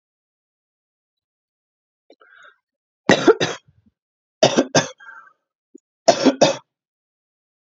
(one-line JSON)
{"three_cough_length": "7.8 s", "three_cough_amplitude": 30771, "three_cough_signal_mean_std_ratio": 0.26, "survey_phase": "beta (2021-08-13 to 2022-03-07)", "age": "45-64", "gender": "Female", "wearing_mask": "No", "symptom_cough_any": true, "symptom_runny_or_blocked_nose": true, "symptom_headache": true, "symptom_change_to_sense_of_smell_or_taste": true, "symptom_loss_of_taste": true, "symptom_other": true, "smoker_status": "Ex-smoker", "respiratory_condition_asthma": false, "respiratory_condition_other": false, "recruitment_source": "Test and Trace", "submission_delay": "2 days", "covid_test_result": "Positive", "covid_test_method": "RT-qPCR"}